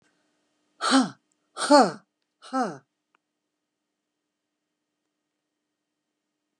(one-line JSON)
{"exhalation_length": "6.6 s", "exhalation_amplitude": 18634, "exhalation_signal_mean_std_ratio": 0.24, "survey_phase": "beta (2021-08-13 to 2022-03-07)", "age": "45-64", "gender": "Female", "wearing_mask": "No", "symptom_none": true, "smoker_status": "Never smoked", "respiratory_condition_asthma": false, "respiratory_condition_other": false, "recruitment_source": "REACT", "submission_delay": "2 days", "covid_test_result": "Negative", "covid_test_method": "RT-qPCR", "influenza_a_test_result": "Negative", "influenza_b_test_result": "Negative"}